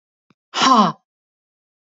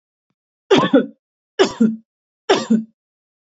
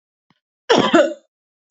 {
  "exhalation_length": "1.9 s",
  "exhalation_amplitude": 32380,
  "exhalation_signal_mean_std_ratio": 0.36,
  "three_cough_length": "3.5 s",
  "three_cough_amplitude": 27884,
  "three_cough_signal_mean_std_ratio": 0.39,
  "cough_length": "1.7 s",
  "cough_amplitude": 29842,
  "cough_signal_mean_std_ratio": 0.38,
  "survey_phase": "beta (2021-08-13 to 2022-03-07)",
  "age": "18-44",
  "gender": "Female",
  "wearing_mask": "No",
  "symptom_none": true,
  "symptom_onset": "4 days",
  "smoker_status": "Ex-smoker",
  "respiratory_condition_asthma": false,
  "respiratory_condition_other": false,
  "recruitment_source": "REACT",
  "submission_delay": "2 days",
  "covid_test_result": "Negative",
  "covid_test_method": "RT-qPCR",
  "influenza_a_test_result": "Negative",
  "influenza_b_test_result": "Negative"
}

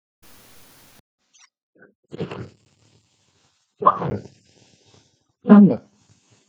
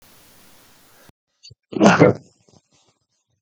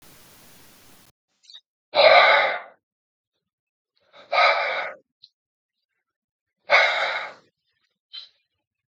{
  "three_cough_length": "6.5 s",
  "three_cough_amplitude": 32766,
  "three_cough_signal_mean_std_ratio": 0.23,
  "cough_length": "3.4 s",
  "cough_amplitude": 32768,
  "cough_signal_mean_std_ratio": 0.26,
  "exhalation_length": "8.9 s",
  "exhalation_amplitude": 29667,
  "exhalation_signal_mean_std_ratio": 0.34,
  "survey_phase": "beta (2021-08-13 to 2022-03-07)",
  "age": "65+",
  "gender": "Male",
  "wearing_mask": "No",
  "symptom_none": true,
  "smoker_status": "Never smoked",
  "respiratory_condition_asthma": false,
  "respiratory_condition_other": false,
  "recruitment_source": "REACT",
  "submission_delay": "1 day",
  "covid_test_result": "Negative",
  "covid_test_method": "RT-qPCR",
  "influenza_a_test_result": "Negative",
  "influenza_b_test_result": "Negative"
}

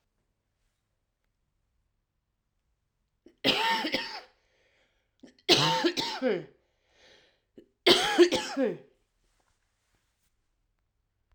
{
  "three_cough_length": "11.3 s",
  "three_cough_amplitude": 17359,
  "three_cough_signal_mean_std_ratio": 0.33,
  "survey_phase": "alpha (2021-03-01 to 2021-08-12)",
  "age": "45-64",
  "gender": "Female",
  "wearing_mask": "No",
  "symptom_cough_any": true,
  "symptom_shortness_of_breath": true,
  "symptom_abdominal_pain": true,
  "symptom_diarrhoea": true,
  "symptom_fatigue": true,
  "symptom_fever_high_temperature": true,
  "symptom_headache": true,
  "symptom_change_to_sense_of_smell_or_taste": true,
  "symptom_loss_of_taste": true,
  "symptom_onset": "3 days",
  "smoker_status": "Current smoker (e-cigarettes or vapes only)",
  "respiratory_condition_asthma": false,
  "respiratory_condition_other": false,
  "recruitment_source": "Test and Trace",
  "submission_delay": "2 days",
  "covid_test_result": "Positive",
  "covid_test_method": "RT-qPCR",
  "covid_ct_value": 17.4,
  "covid_ct_gene": "ORF1ab gene",
  "covid_ct_mean": 17.6,
  "covid_viral_load": "1700000 copies/ml",
  "covid_viral_load_category": "High viral load (>1M copies/ml)"
}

